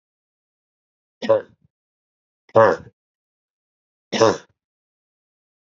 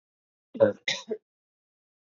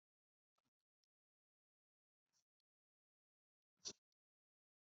{"three_cough_length": "5.6 s", "three_cough_amplitude": 28357, "three_cough_signal_mean_std_ratio": 0.24, "cough_length": "2.0 s", "cough_amplitude": 14504, "cough_signal_mean_std_ratio": 0.26, "exhalation_length": "4.9 s", "exhalation_amplitude": 484, "exhalation_signal_mean_std_ratio": 0.09, "survey_phase": "beta (2021-08-13 to 2022-03-07)", "age": "45-64", "gender": "Female", "wearing_mask": "No", "symptom_cough_any": true, "symptom_runny_or_blocked_nose": true, "symptom_onset": "12 days", "smoker_status": "Never smoked", "respiratory_condition_asthma": false, "respiratory_condition_other": false, "recruitment_source": "Test and Trace", "submission_delay": "2 days", "covid_test_result": "Positive", "covid_test_method": "RT-qPCR", "covid_ct_value": 23.9, "covid_ct_gene": "ORF1ab gene"}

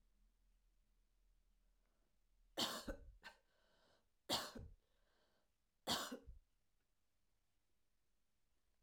{"three_cough_length": "8.8 s", "three_cough_amplitude": 1469, "three_cough_signal_mean_std_ratio": 0.3, "survey_phase": "alpha (2021-03-01 to 2021-08-12)", "age": "65+", "gender": "Female", "wearing_mask": "No", "symptom_none": true, "smoker_status": "Never smoked", "respiratory_condition_asthma": false, "respiratory_condition_other": false, "recruitment_source": "REACT", "submission_delay": "2 days", "covid_test_result": "Negative", "covid_test_method": "RT-qPCR"}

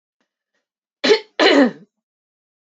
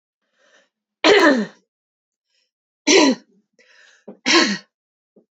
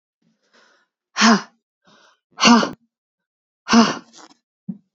{"cough_length": "2.7 s", "cough_amplitude": 29732, "cough_signal_mean_std_ratio": 0.33, "three_cough_length": "5.4 s", "three_cough_amplitude": 29644, "three_cough_signal_mean_std_ratio": 0.35, "exhalation_length": "4.9 s", "exhalation_amplitude": 32768, "exhalation_signal_mean_std_ratio": 0.31, "survey_phase": "beta (2021-08-13 to 2022-03-07)", "age": "18-44", "gender": "Female", "wearing_mask": "No", "symptom_cough_any": true, "symptom_shortness_of_breath": true, "symptom_fatigue": true, "smoker_status": "Never smoked", "respiratory_condition_asthma": true, "respiratory_condition_other": false, "recruitment_source": "Test and Trace", "submission_delay": "1 day", "covid_test_result": "Positive", "covid_test_method": "ePCR"}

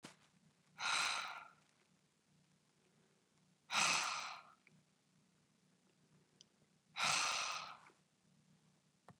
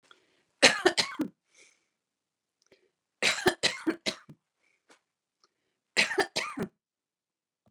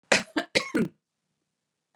{"exhalation_length": "9.2 s", "exhalation_amplitude": 2207, "exhalation_signal_mean_std_ratio": 0.37, "three_cough_length": "7.7 s", "three_cough_amplitude": 25923, "three_cough_signal_mean_std_ratio": 0.29, "cough_length": "2.0 s", "cough_amplitude": 16186, "cough_signal_mean_std_ratio": 0.33, "survey_phase": "beta (2021-08-13 to 2022-03-07)", "age": "65+", "gender": "Female", "wearing_mask": "No", "symptom_sore_throat": true, "symptom_abdominal_pain": true, "symptom_fatigue": true, "symptom_headache": true, "symptom_onset": "12 days", "smoker_status": "Current smoker (1 to 10 cigarettes per day)", "respiratory_condition_asthma": false, "respiratory_condition_other": false, "recruitment_source": "REACT", "submission_delay": "2 days", "covid_test_result": "Positive", "covid_test_method": "RT-qPCR", "covid_ct_value": 35.0, "covid_ct_gene": "N gene", "influenza_a_test_result": "Negative", "influenza_b_test_result": "Negative"}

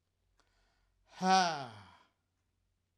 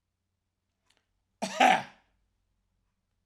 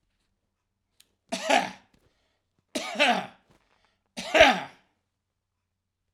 {"exhalation_length": "3.0 s", "exhalation_amplitude": 6529, "exhalation_signal_mean_std_ratio": 0.3, "cough_length": "3.3 s", "cough_amplitude": 12006, "cough_signal_mean_std_ratio": 0.23, "three_cough_length": "6.1 s", "three_cough_amplitude": 27019, "three_cough_signal_mean_std_ratio": 0.29, "survey_phase": "alpha (2021-03-01 to 2021-08-12)", "age": "65+", "gender": "Male", "wearing_mask": "No", "symptom_none": true, "smoker_status": "Ex-smoker", "respiratory_condition_asthma": false, "respiratory_condition_other": false, "recruitment_source": "REACT", "submission_delay": "10 days", "covid_test_result": "Negative", "covid_test_method": "RT-qPCR"}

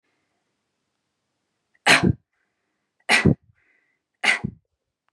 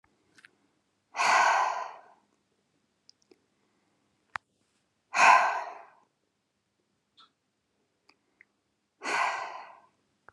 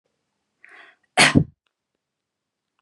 {"three_cough_length": "5.1 s", "three_cough_amplitude": 30735, "three_cough_signal_mean_std_ratio": 0.27, "exhalation_length": "10.3 s", "exhalation_amplitude": 17819, "exhalation_signal_mean_std_ratio": 0.3, "cough_length": "2.8 s", "cough_amplitude": 30368, "cough_signal_mean_std_ratio": 0.22, "survey_phase": "beta (2021-08-13 to 2022-03-07)", "age": "18-44", "gender": "Female", "wearing_mask": "No", "symptom_none": true, "symptom_onset": "11 days", "smoker_status": "Never smoked", "respiratory_condition_asthma": false, "respiratory_condition_other": false, "recruitment_source": "REACT", "submission_delay": "1 day", "covid_test_result": "Negative", "covid_test_method": "RT-qPCR", "influenza_a_test_result": "Negative", "influenza_b_test_result": "Negative"}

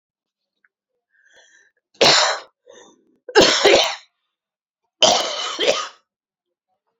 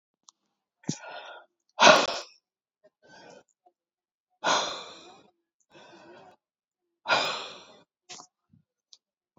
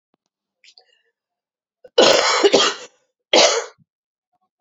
{"three_cough_length": "7.0 s", "three_cough_amplitude": 32767, "three_cough_signal_mean_std_ratio": 0.37, "exhalation_length": "9.4 s", "exhalation_amplitude": 26872, "exhalation_signal_mean_std_ratio": 0.24, "cough_length": "4.6 s", "cough_amplitude": 30433, "cough_signal_mean_std_ratio": 0.37, "survey_phase": "beta (2021-08-13 to 2022-03-07)", "age": "45-64", "gender": "Female", "wearing_mask": "No", "symptom_cough_any": true, "symptom_runny_or_blocked_nose": true, "symptom_shortness_of_breath": true, "symptom_sore_throat": true, "symptom_fatigue": true, "symptom_fever_high_temperature": true, "symptom_headache": true, "symptom_onset": "5 days", "smoker_status": "Ex-smoker", "respiratory_condition_asthma": true, "respiratory_condition_other": false, "recruitment_source": "Test and Trace", "submission_delay": "2 days", "covid_test_result": "Positive", "covid_test_method": "RT-qPCR", "covid_ct_value": 19.9, "covid_ct_gene": "ORF1ab gene", "covid_ct_mean": 20.3, "covid_viral_load": "220000 copies/ml", "covid_viral_load_category": "Low viral load (10K-1M copies/ml)"}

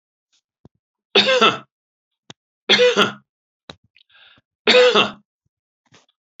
{"three_cough_length": "6.4 s", "three_cough_amplitude": 32470, "three_cough_signal_mean_std_ratio": 0.35, "survey_phase": "beta (2021-08-13 to 2022-03-07)", "age": "65+", "gender": "Male", "wearing_mask": "No", "symptom_none": true, "smoker_status": "Ex-smoker", "respiratory_condition_asthma": false, "respiratory_condition_other": false, "recruitment_source": "REACT", "submission_delay": "2 days", "covid_test_result": "Negative", "covid_test_method": "RT-qPCR"}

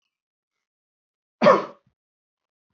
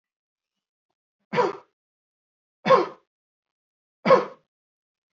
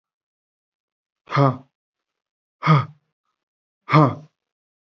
{"cough_length": "2.7 s", "cough_amplitude": 25749, "cough_signal_mean_std_ratio": 0.21, "three_cough_length": "5.1 s", "three_cough_amplitude": 21738, "three_cough_signal_mean_std_ratio": 0.24, "exhalation_length": "4.9 s", "exhalation_amplitude": 27526, "exhalation_signal_mean_std_ratio": 0.27, "survey_phase": "alpha (2021-03-01 to 2021-08-12)", "age": "18-44", "gender": "Male", "wearing_mask": "No", "symptom_none": true, "symptom_onset": "12 days", "smoker_status": "Never smoked", "respiratory_condition_asthma": false, "respiratory_condition_other": false, "recruitment_source": "REACT", "submission_delay": "1 day", "covid_test_result": "Negative", "covid_test_method": "RT-qPCR"}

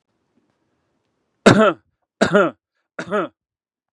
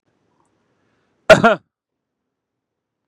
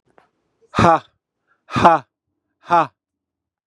{"three_cough_length": "3.9 s", "three_cough_amplitude": 32768, "three_cough_signal_mean_std_ratio": 0.31, "cough_length": "3.1 s", "cough_amplitude": 32768, "cough_signal_mean_std_ratio": 0.19, "exhalation_length": "3.7 s", "exhalation_amplitude": 32768, "exhalation_signal_mean_std_ratio": 0.31, "survey_phase": "beta (2021-08-13 to 2022-03-07)", "age": "45-64", "gender": "Male", "wearing_mask": "No", "symptom_none": true, "smoker_status": "Ex-smoker", "respiratory_condition_asthma": false, "respiratory_condition_other": false, "recruitment_source": "REACT", "submission_delay": "1 day", "covid_test_result": "Negative", "covid_test_method": "RT-qPCR", "influenza_a_test_result": "Negative", "influenza_b_test_result": "Negative"}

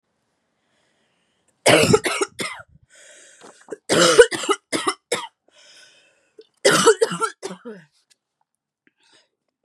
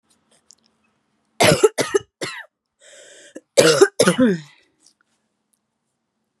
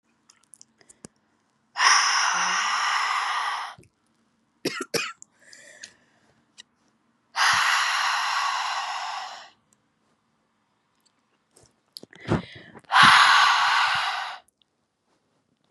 {"cough_length": "9.6 s", "cough_amplitude": 32768, "cough_signal_mean_std_ratio": 0.33, "three_cough_length": "6.4 s", "three_cough_amplitude": 32768, "three_cough_signal_mean_std_ratio": 0.32, "exhalation_length": "15.7 s", "exhalation_amplitude": 24527, "exhalation_signal_mean_std_ratio": 0.46, "survey_phase": "beta (2021-08-13 to 2022-03-07)", "age": "18-44", "gender": "Female", "wearing_mask": "No", "symptom_cough_any": true, "symptom_runny_or_blocked_nose": true, "symptom_sore_throat": true, "symptom_fatigue": true, "symptom_headache": true, "symptom_onset": "3 days", "smoker_status": "Never smoked", "respiratory_condition_asthma": false, "respiratory_condition_other": false, "recruitment_source": "Test and Trace", "submission_delay": "2 days", "covid_test_result": "Positive", "covid_test_method": "RT-qPCR", "covid_ct_value": 25.6, "covid_ct_gene": "ORF1ab gene", "covid_ct_mean": 26.0, "covid_viral_load": "3100 copies/ml", "covid_viral_load_category": "Minimal viral load (< 10K copies/ml)"}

